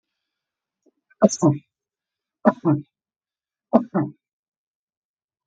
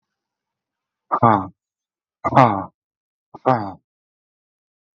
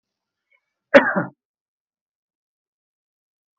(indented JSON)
{
  "three_cough_length": "5.5 s",
  "three_cough_amplitude": 32768,
  "three_cough_signal_mean_std_ratio": 0.26,
  "exhalation_length": "4.9 s",
  "exhalation_amplitude": 32768,
  "exhalation_signal_mean_std_ratio": 0.28,
  "cough_length": "3.6 s",
  "cough_amplitude": 32768,
  "cough_signal_mean_std_ratio": 0.18,
  "survey_phase": "beta (2021-08-13 to 2022-03-07)",
  "age": "45-64",
  "gender": "Male",
  "wearing_mask": "No",
  "symptom_none": true,
  "smoker_status": "Ex-smoker",
  "respiratory_condition_asthma": false,
  "respiratory_condition_other": false,
  "recruitment_source": "REACT",
  "submission_delay": "2 days",
  "covid_test_result": "Negative",
  "covid_test_method": "RT-qPCR"
}